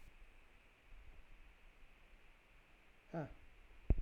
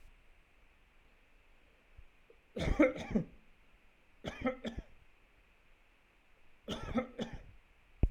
{
  "exhalation_length": "4.0 s",
  "exhalation_amplitude": 3729,
  "exhalation_signal_mean_std_ratio": 0.31,
  "three_cough_length": "8.1 s",
  "three_cough_amplitude": 6194,
  "three_cough_signal_mean_std_ratio": 0.33,
  "survey_phase": "alpha (2021-03-01 to 2021-08-12)",
  "age": "18-44",
  "gender": "Male",
  "wearing_mask": "No",
  "symptom_none": true,
  "smoker_status": "Never smoked",
  "respiratory_condition_asthma": false,
  "respiratory_condition_other": false,
  "recruitment_source": "REACT",
  "submission_delay": "2 days",
  "covid_test_result": "Negative",
  "covid_test_method": "RT-qPCR"
}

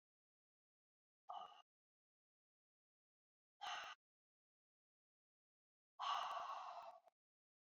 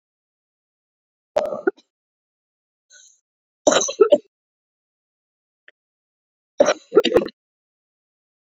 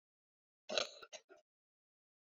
{
  "exhalation_length": "7.7 s",
  "exhalation_amplitude": 852,
  "exhalation_signal_mean_std_ratio": 0.33,
  "three_cough_length": "8.4 s",
  "three_cough_amplitude": 27677,
  "three_cough_signal_mean_std_ratio": 0.24,
  "cough_length": "2.4 s",
  "cough_amplitude": 4253,
  "cough_signal_mean_std_ratio": 0.22,
  "survey_phase": "beta (2021-08-13 to 2022-03-07)",
  "age": "45-64",
  "gender": "Female",
  "wearing_mask": "No",
  "symptom_cough_any": true,
  "symptom_onset": "3 days",
  "smoker_status": "Prefer not to say",
  "respiratory_condition_asthma": false,
  "respiratory_condition_other": false,
  "recruitment_source": "Test and Trace",
  "submission_delay": "2 days",
  "covid_test_result": "Positive",
  "covid_test_method": "RT-qPCR",
  "covid_ct_value": 17.9,
  "covid_ct_gene": "ORF1ab gene",
  "covid_ct_mean": 18.6,
  "covid_viral_load": "810000 copies/ml",
  "covid_viral_load_category": "Low viral load (10K-1M copies/ml)"
}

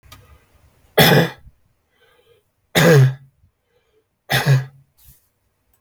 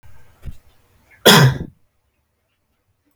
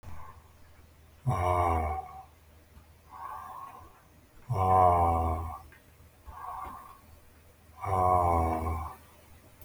{
  "three_cough_length": "5.8 s",
  "three_cough_amplitude": 32768,
  "three_cough_signal_mean_std_ratio": 0.35,
  "cough_length": "3.2 s",
  "cough_amplitude": 32768,
  "cough_signal_mean_std_ratio": 0.28,
  "exhalation_length": "9.6 s",
  "exhalation_amplitude": 8775,
  "exhalation_signal_mean_std_ratio": 0.53,
  "survey_phase": "beta (2021-08-13 to 2022-03-07)",
  "age": "18-44",
  "gender": "Male",
  "wearing_mask": "No",
  "symptom_none": true,
  "symptom_onset": "3 days",
  "smoker_status": "Never smoked",
  "respiratory_condition_asthma": false,
  "respiratory_condition_other": false,
  "recruitment_source": "REACT",
  "submission_delay": "8 days",
  "covid_test_result": "Negative",
  "covid_test_method": "RT-qPCR"
}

